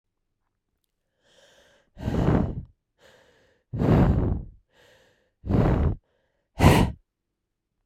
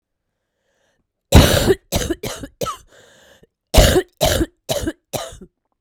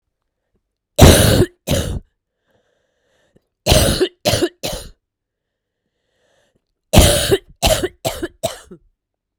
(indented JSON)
{
  "exhalation_length": "7.9 s",
  "exhalation_amplitude": 26891,
  "exhalation_signal_mean_std_ratio": 0.4,
  "cough_length": "5.8 s",
  "cough_amplitude": 32768,
  "cough_signal_mean_std_ratio": 0.38,
  "three_cough_length": "9.4 s",
  "three_cough_amplitude": 32768,
  "three_cough_signal_mean_std_ratio": 0.37,
  "survey_phase": "beta (2021-08-13 to 2022-03-07)",
  "age": "45-64",
  "gender": "Female",
  "wearing_mask": "No",
  "symptom_cough_any": true,
  "symptom_runny_or_blocked_nose": true,
  "symptom_sore_throat": true,
  "symptom_abdominal_pain": true,
  "symptom_fatigue": true,
  "symptom_fever_high_temperature": true,
  "symptom_headache": true,
  "symptom_onset": "4 days",
  "smoker_status": "Never smoked",
  "respiratory_condition_asthma": true,
  "respiratory_condition_other": false,
  "recruitment_source": "Test and Trace",
  "submission_delay": "2 days",
  "covid_test_result": "Positive",
  "covid_test_method": "RT-qPCR",
  "covid_ct_value": 31.6,
  "covid_ct_gene": "ORF1ab gene"
}